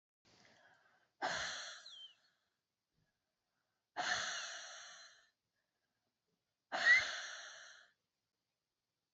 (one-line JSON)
{"exhalation_length": "9.1 s", "exhalation_amplitude": 3935, "exhalation_signal_mean_std_ratio": 0.31, "survey_phase": "beta (2021-08-13 to 2022-03-07)", "age": "45-64", "gender": "Female", "wearing_mask": "No", "symptom_none": true, "smoker_status": "Never smoked", "respiratory_condition_asthma": true, "respiratory_condition_other": false, "recruitment_source": "Test and Trace", "submission_delay": "3 days", "covid_test_result": "Negative", "covid_test_method": "RT-qPCR"}